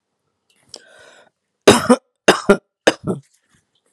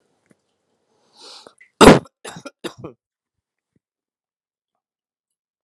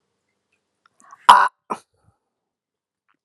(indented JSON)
{
  "three_cough_length": "3.9 s",
  "three_cough_amplitude": 32768,
  "three_cough_signal_mean_std_ratio": 0.27,
  "cough_length": "5.6 s",
  "cough_amplitude": 32768,
  "cough_signal_mean_std_ratio": 0.16,
  "exhalation_length": "3.2 s",
  "exhalation_amplitude": 32768,
  "exhalation_signal_mean_std_ratio": 0.19,
  "survey_phase": "alpha (2021-03-01 to 2021-08-12)",
  "age": "18-44",
  "gender": "Male",
  "wearing_mask": "No",
  "symptom_fatigue": true,
  "symptom_fever_high_temperature": true,
  "symptom_headache": true,
  "symptom_onset": "2 days",
  "smoker_status": "Never smoked",
  "respiratory_condition_asthma": false,
  "respiratory_condition_other": false,
  "recruitment_source": "Test and Trace",
  "submission_delay": "1 day",
  "covid_test_result": "Positive",
  "covid_test_method": "RT-qPCR"
}